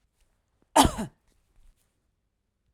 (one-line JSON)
{"cough_length": "2.7 s", "cough_amplitude": 24425, "cough_signal_mean_std_ratio": 0.21, "survey_phase": "alpha (2021-03-01 to 2021-08-12)", "age": "45-64", "gender": "Female", "wearing_mask": "No", "symptom_none": true, "symptom_onset": "8 days", "smoker_status": "Ex-smoker", "respiratory_condition_asthma": false, "respiratory_condition_other": false, "recruitment_source": "REACT", "submission_delay": "4 days", "covid_test_result": "Negative", "covid_test_method": "RT-qPCR"}